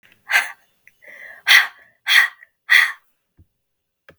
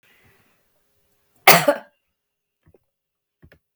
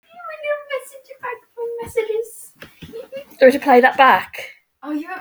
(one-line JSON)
{"exhalation_length": "4.2 s", "exhalation_amplitude": 32768, "exhalation_signal_mean_std_ratio": 0.34, "cough_length": "3.8 s", "cough_amplitude": 32768, "cough_signal_mean_std_ratio": 0.19, "three_cough_length": "5.2 s", "three_cough_amplitude": 32768, "three_cough_signal_mean_std_ratio": 0.45, "survey_phase": "beta (2021-08-13 to 2022-03-07)", "age": "45-64", "gender": "Female", "wearing_mask": "No", "symptom_cough_any": true, "symptom_runny_or_blocked_nose": true, "symptom_headache": true, "smoker_status": "Never smoked", "respiratory_condition_asthma": false, "respiratory_condition_other": false, "recruitment_source": "Test and Trace", "submission_delay": "1 day", "covid_test_result": "Positive", "covid_test_method": "RT-qPCR", "covid_ct_value": 30.8, "covid_ct_gene": "ORF1ab gene", "covid_ct_mean": 31.7, "covid_viral_load": "40 copies/ml", "covid_viral_load_category": "Minimal viral load (< 10K copies/ml)"}